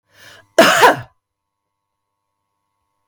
{"cough_length": "3.1 s", "cough_amplitude": 32768, "cough_signal_mean_std_ratio": 0.29, "survey_phase": "beta (2021-08-13 to 2022-03-07)", "age": "45-64", "gender": "Female", "wearing_mask": "No", "symptom_cough_any": true, "symptom_runny_or_blocked_nose": true, "symptom_fatigue": true, "symptom_fever_high_temperature": true, "symptom_headache": true, "symptom_onset": "2 days", "smoker_status": "Never smoked", "respiratory_condition_asthma": false, "respiratory_condition_other": false, "recruitment_source": "Test and Trace", "submission_delay": "1 day", "covid_test_result": "Positive", "covid_test_method": "RT-qPCR", "covid_ct_value": 18.9, "covid_ct_gene": "ORF1ab gene", "covid_ct_mean": 18.9, "covid_viral_load": "610000 copies/ml", "covid_viral_load_category": "Low viral load (10K-1M copies/ml)"}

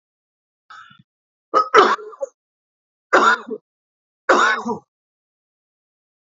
{"three_cough_length": "6.3 s", "three_cough_amplitude": 30145, "three_cough_signal_mean_std_ratio": 0.32, "survey_phase": "alpha (2021-03-01 to 2021-08-12)", "age": "45-64", "gender": "Male", "wearing_mask": "No", "symptom_none": true, "smoker_status": "Never smoked", "respiratory_condition_asthma": true, "respiratory_condition_other": false, "recruitment_source": "REACT", "submission_delay": "2 days", "covid_test_result": "Negative", "covid_test_method": "RT-qPCR"}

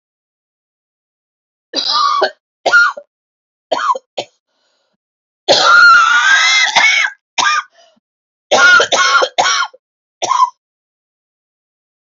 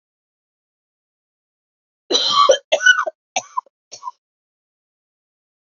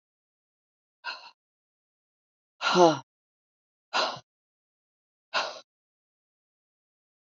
{"three_cough_length": "12.1 s", "three_cough_amplitude": 32768, "three_cough_signal_mean_std_ratio": 0.51, "cough_length": "5.6 s", "cough_amplitude": 29042, "cough_signal_mean_std_ratio": 0.29, "exhalation_length": "7.3 s", "exhalation_amplitude": 16593, "exhalation_signal_mean_std_ratio": 0.22, "survey_phase": "alpha (2021-03-01 to 2021-08-12)", "age": "45-64", "gender": "Female", "wearing_mask": "No", "symptom_new_continuous_cough": true, "symptom_shortness_of_breath": true, "symptom_fatigue": true, "symptom_fever_high_temperature": true, "symptom_headache": true, "symptom_change_to_sense_of_smell_or_taste": true, "smoker_status": "Never smoked", "respiratory_condition_asthma": false, "respiratory_condition_other": false, "recruitment_source": "Test and Trace", "submission_delay": "1 day", "covid_test_result": "Positive", "covid_test_method": "RT-qPCR", "covid_ct_value": 20.5, "covid_ct_gene": "ORF1ab gene", "covid_ct_mean": 21.2, "covid_viral_load": "110000 copies/ml", "covid_viral_load_category": "Low viral load (10K-1M copies/ml)"}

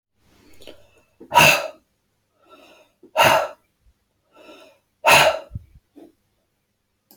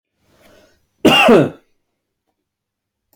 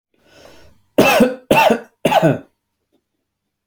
{"exhalation_length": "7.2 s", "exhalation_amplitude": 30175, "exhalation_signal_mean_std_ratio": 0.3, "cough_length": "3.2 s", "cough_amplitude": 30302, "cough_signal_mean_std_ratio": 0.32, "three_cough_length": "3.7 s", "three_cough_amplitude": 29431, "three_cough_signal_mean_std_ratio": 0.42, "survey_phase": "alpha (2021-03-01 to 2021-08-12)", "age": "45-64", "gender": "Male", "wearing_mask": "No", "symptom_none": true, "smoker_status": "Ex-smoker", "respiratory_condition_asthma": false, "respiratory_condition_other": false, "recruitment_source": "REACT", "submission_delay": "2 days", "covid_test_result": "Negative", "covid_test_method": "RT-qPCR"}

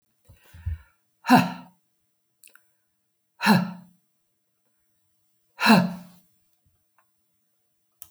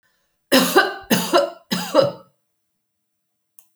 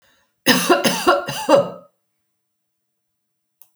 {"exhalation_length": "8.1 s", "exhalation_amplitude": 22946, "exhalation_signal_mean_std_ratio": 0.25, "three_cough_length": "3.8 s", "three_cough_amplitude": 32768, "three_cough_signal_mean_std_ratio": 0.42, "cough_length": "3.8 s", "cough_amplitude": 30750, "cough_signal_mean_std_ratio": 0.41, "survey_phase": "alpha (2021-03-01 to 2021-08-12)", "age": "65+", "gender": "Female", "wearing_mask": "No", "symptom_none": true, "smoker_status": "Never smoked", "respiratory_condition_asthma": false, "respiratory_condition_other": false, "recruitment_source": "REACT", "submission_delay": "2 days", "covid_test_result": "Negative", "covid_test_method": "RT-qPCR"}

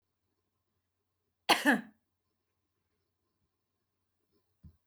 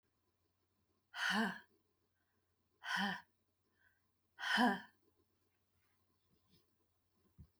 {"cough_length": "4.9 s", "cough_amplitude": 11005, "cough_signal_mean_std_ratio": 0.18, "exhalation_length": "7.6 s", "exhalation_amplitude": 2896, "exhalation_signal_mean_std_ratio": 0.31, "survey_phase": "beta (2021-08-13 to 2022-03-07)", "age": "45-64", "gender": "Female", "wearing_mask": "No", "symptom_none": true, "smoker_status": "Ex-smoker", "respiratory_condition_asthma": false, "respiratory_condition_other": false, "recruitment_source": "REACT", "submission_delay": "4 days", "covid_test_result": "Negative", "covid_test_method": "RT-qPCR", "influenza_a_test_result": "Unknown/Void", "influenza_b_test_result": "Unknown/Void"}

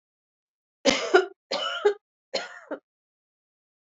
{"three_cough_length": "3.9 s", "three_cough_amplitude": 18328, "three_cough_signal_mean_std_ratio": 0.33, "survey_phase": "beta (2021-08-13 to 2022-03-07)", "age": "45-64", "gender": "Female", "wearing_mask": "No", "symptom_cough_any": true, "symptom_runny_or_blocked_nose": true, "symptom_fatigue": true, "symptom_onset": "5 days", "smoker_status": "Never smoked", "respiratory_condition_asthma": false, "respiratory_condition_other": false, "recruitment_source": "Test and Trace", "submission_delay": "1 day", "covid_test_result": "Positive", "covid_test_method": "RT-qPCR", "covid_ct_value": 17.0, "covid_ct_gene": "N gene", "covid_ct_mean": 18.0, "covid_viral_load": "1300000 copies/ml", "covid_viral_load_category": "High viral load (>1M copies/ml)"}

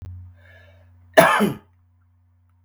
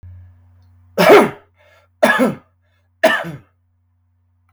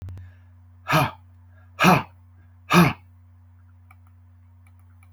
{"cough_length": "2.6 s", "cough_amplitude": 32768, "cough_signal_mean_std_ratio": 0.3, "three_cough_length": "4.5 s", "three_cough_amplitude": 32768, "three_cough_signal_mean_std_ratio": 0.34, "exhalation_length": "5.1 s", "exhalation_amplitude": 25254, "exhalation_signal_mean_std_ratio": 0.33, "survey_phase": "beta (2021-08-13 to 2022-03-07)", "age": "18-44", "gender": "Male", "wearing_mask": "No", "symptom_none": true, "smoker_status": "Never smoked", "respiratory_condition_asthma": false, "respiratory_condition_other": false, "recruitment_source": "REACT", "submission_delay": "2 days", "covid_test_result": "Negative", "covid_test_method": "RT-qPCR"}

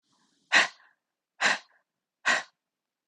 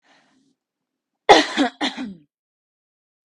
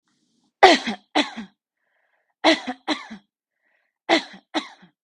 {"exhalation_length": "3.1 s", "exhalation_amplitude": 15198, "exhalation_signal_mean_std_ratio": 0.3, "cough_length": "3.2 s", "cough_amplitude": 32768, "cough_signal_mean_std_ratio": 0.26, "three_cough_length": "5.0 s", "three_cough_amplitude": 32768, "three_cough_signal_mean_std_ratio": 0.29, "survey_phase": "beta (2021-08-13 to 2022-03-07)", "age": "18-44", "gender": "Female", "wearing_mask": "No", "symptom_none": true, "smoker_status": "Ex-smoker", "respiratory_condition_asthma": false, "respiratory_condition_other": false, "recruitment_source": "REACT", "submission_delay": "2 days", "covid_test_result": "Negative", "covid_test_method": "RT-qPCR", "influenza_a_test_result": "Unknown/Void", "influenza_b_test_result": "Unknown/Void"}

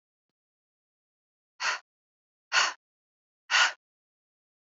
{"exhalation_length": "4.7 s", "exhalation_amplitude": 10357, "exhalation_signal_mean_std_ratio": 0.26, "survey_phase": "alpha (2021-03-01 to 2021-08-12)", "age": "18-44", "gender": "Female", "wearing_mask": "No", "symptom_cough_any": true, "symptom_headache": true, "symptom_onset": "3 days", "smoker_status": "Current smoker (1 to 10 cigarettes per day)", "respiratory_condition_asthma": true, "respiratory_condition_other": false, "recruitment_source": "Test and Trace", "submission_delay": "1 day", "covid_test_result": "Positive", "covid_test_method": "RT-qPCR", "covid_ct_value": 29.1, "covid_ct_gene": "ORF1ab gene", "covid_ct_mean": 29.6, "covid_viral_load": "200 copies/ml", "covid_viral_load_category": "Minimal viral load (< 10K copies/ml)"}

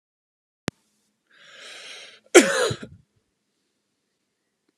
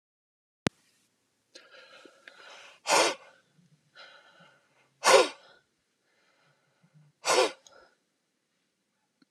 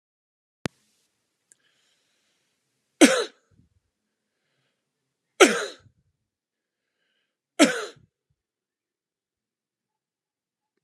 {"cough_length": "4.8 s", "cough_amplitude": 32767, "cough_signal_mean_std_ratio": 0.2, "exhalation_length": "9.3 s", "exhalation_amplitude": 19024, "exhalation_signal_mean_std_ratio": 0.23, "three_cough_length": "10.8 s", "three_cough_amplitude": 32523, "three_cough_signal_mean_std_ratio": 0.17, "survey_phase": "alpha (2021-03-01 to 2021-08-12)", "age": "65+", "gender": "Male", "wearing_mask": "No", "symptom_none": true, "smoker_status": "Never smoked", "respiratory_condition_asthma": false, "respiratory_condition_other": false, "recruitment_source": "REACT", "submission_delay": "1 day", "covid_test_result": "Negative", "covid_test_method": "RT-qPCR"}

